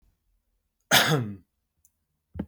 {
  "cough_length": "2.5 s",
  "cough_amplitude": 18051,
  "cough_signal_mean_std_ratio": 0.32,
  "survey_phase": "beta (2021-08-13 to 2022-03-07)",
  "age": "18-44",
  "gender": "Male",
  "wearing_mask": "No",
  "symptom_none": true,
  "symptom_onset": "13 days",
  "smoker_status": "Never smoked",
  "respiratory_condition_asthma": false,
  "respiratory_condition_other": false,
  "recruitment_source": "REACT",
  "submission_delay": "3 days",
  "covid_test_result": "Negative",
  "covid_test_method": "RT-qPCR",
  "influenza_a_test_result": "Negative",
  "influenza_b_test_result": "Negative"
}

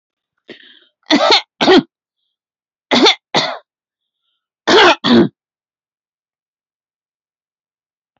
{
  "three_cough_length": "8.2 s",
  "three_cough_amplitude": 32767,
  "three_cough_signal_mean_std_ratio": 0.34,
  "survey_phase": "beta (2021-08-13 to 2022-03-07)",
  "age": "45-64",
  "gender": "Female",
  "wearing_mask": "No",
  "symptom_none": true,
  "smoker_status": "Never smoked",
  "respiratory_condition_asthma": false,
  "respiratory_condition_other": false,
  "recruitment_source": "REACT",
  "submission_delay": "1 day",
  "covid_test_result": "Negative",
  "covid_test_method": "RT-qPCR",
  "influenza_a_test_result": "Negative",
  "influenza_b_test_result": "Negative"
}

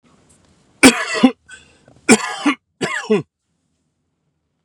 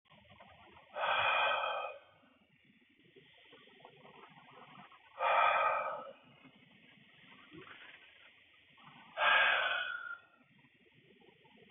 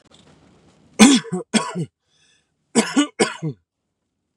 {
  "three_cough_length": "4.6 s",
  "three_cough_amplitude": 32768,
  "three_cough_signal_mean_std_ratio": 0.32,
  "exhalation_length": "11.7 s",
  "exhalation_amplitude": 4494,
  "exhalation_signal_mean_std_ratio": 0.43,
  "cough_length": "4.4 s",
  "cough_amplitude": 32768,
  "cough_signal_mean_std_ratio": 0.34,
  "survey_phase": "beta (2021-08-13 to 2022-03-07)",
  "age": "45-64",
  "gender": "Male",
  "wearing_mask": "No",
  "symptom_shortness_of_breath": true,
  "symptom_fatigue": true,
  "symptom_onset": "12 days",
  "smoker_status": "Ex-smoker",
  "respiratory_condition_asthma": false,
  "respiratory_condition_other": false,
  "recruitment_source": "REACT",
  "submission_delay": "2 days",
  "covid_test_result": "Negative",
  "covid_test_method": "RT-qPCR",
  "influenza_a_test_result": "Negative",
  "influenza_b_test_result": "Negative"
}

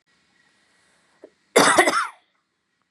{
  "cough_length": "2.9 s",
  "cough_amplitude": 29213,
  "cough_signal_mean_std_ratio": 0.32,
  "survey_phase": "beta (2021-08-13 to 2022-03-07)",
  "age": "18-44",
  "gender": "Female",
  "wearing_mask": "No",
  "symptom_fatigue": true,
  "symptom_headache": true,
  "symptom_change_to_sense_of_smell_or_taste": true,
  "symptom_loss_of_taste": true,
  "symptom_onset": "3 days",
  "smoker_status": "Never smoked",
  "respiratory_condition_asthma": false,
  "respiratory_condition_other": false,
  "recruitment_source": "REACT",
  "submission_delay": "2 days",
  "covid_test_result": "Positive",
  "covid_test_method": "RT-qPCR",
  "covid_ct_value": 20.0,
  "covid_ct_gene": "E gene",
  "influenza_a_test_result": "Negative",
  "influenza_b_test_result": "Negative"
}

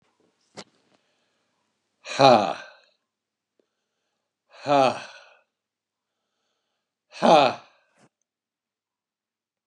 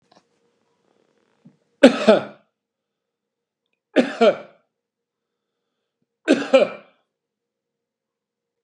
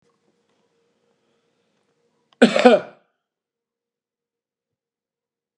{
  "exhalation_length": "9.7 s",
  "exhalation_amplitude": 23423,
  "exhalation_signal_mean_std_ratio": 0.24,
  "three_cough_length": "8.6 s",
  "three_cough_amplitude": 32768,
  "three_cough_signal_mean_std_ratio": 0.23,
  "cough_length": "5.6 s",
  "cough_amplitude": 32768,
  "cough_signal_mean_std_ratio": 0.18,
  "survey_phase": "beta (2021-08-13 to 2022-03-07)",
  "age": "65+",
  "gender": "Male",
  "wearing_mask": "No",
  "symptom_none": true,
  "smoker_status": "Ex-smoker",
  "respiratory_condition_asthma": false,
  "respiratory_condition_other": false,
  "recruitment_source": "REACT",
  "submission_delay": "3 days",
  "covid_test_result": "Negative",
  "covid_test_method": "RT-qPCR",
  "influenza_a_test_result": "Negative",
  "influenza_b_test_result": "Negative"
}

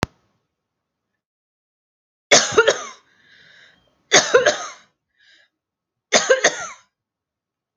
{
  "three_cough_length": "7.8 s",
  "three_cough_amplitude": 32768,
  "three_cough_signal_mean_std_ratio": 0.29,
  "survey_phase": "beta (2021-08-13 to 2022-03-07)",
  "age": "45-64",
  "gender": "Female",
  "wearing_mask": "No",
  "symptom_none": true,
  "smoker_status": "Never smoked",
  "respiratory_condition_asthma": false,
  "respiratory_condition_other": false,
  "recruitment_source": "REACT",
  "submission_delay": "6 days",
  "covid_test_result": "Negative",
  "covid_test_method": "RT-qPCR",
  "influenza_a_test_result": "Negative",
  "influenza_b_test_result": "Negative"
}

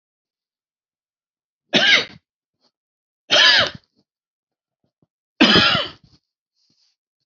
{
  "three_cough_length": "7.3 s",
  "three_cough_amplitude": 30483,
  "three_cough_signal_mean_std_ratio": 0.32,
  "survey_phase": "beta (2021-08-13 to 2022-03-07)",
  "age": "45-64",
  "gender": "Male",
  "wearing_mask": "No",
  "symptom_runny_or_blocked_nose": true,
  "symptom_headache": true,
  "smoker_status": "Never smoked",
  "respiratory_condition_asthma": false,
  "respiratory_condition_other": false,
  "recruitment_source": "REACT",
  "submission_delay": "1 day",
  "covid_test_result": "Negative",
  "covid_test_method": "RT-qPCR"
}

